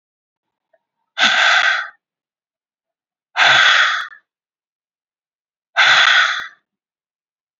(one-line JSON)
{"exhalation_length": "7.6 s", "exhalation_amplitude": 32767, "exhalation_signal_mean_std_ratio": 0.42, "survey_phase": "beta (2021-08-13 to 2022-03-07)", "age": "18-44", "gender": "Female", "wearing_mask": "No", "symptom_cough_any": true, "symptom_onset": "10 days", "smoker_status": "Never smoked", "respiratory_condition_asthma": false, "respiratory_condition_other": false, "recruitment_source": "REACT", "submission_delay": "13 days", "covid_test_result": "Negative", "covid_test_method": "RT-qPCR", "influenza_a_test_result": "Unknown/Void", "influenza_b_test_result": "Unknown/Void"}